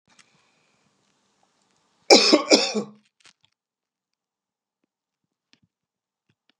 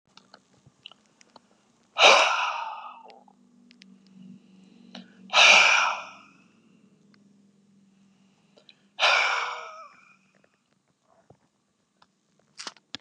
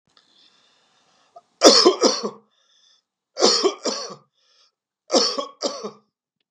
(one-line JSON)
{"cough_length": "6.6 s", "cough_amplitude": 32664, "cough_signal_mean_std_ratio": 0.21, "exhalation_length": "13.0 s", "exhalation_amplitude": 24191, "exhalation_signal_mean_std_ratio": 0.3, "three_cough_length": "6.5 s", "three_cough_amplitude": 32768, "three_cough_signal_mean_std_ratio": 0.35, "survey_phase": "beta (2021-08-13 to 2022-03-07)", "age": "65+", "gender": "Male", "wearing_mask": "No", "symptom_none": true, "smoker_status": "Ex-smoker", "respiratory_condition_asthma": false, "respiratory_condition_other": false, "recruitment_source": "REACT", "submission_delay": "2 days", "covid_test_result": "Negative", "covid_test_method": "RT-qPCR", "influenza_a_test_result": "Negative", "influenza_b_test_result": "Negative"}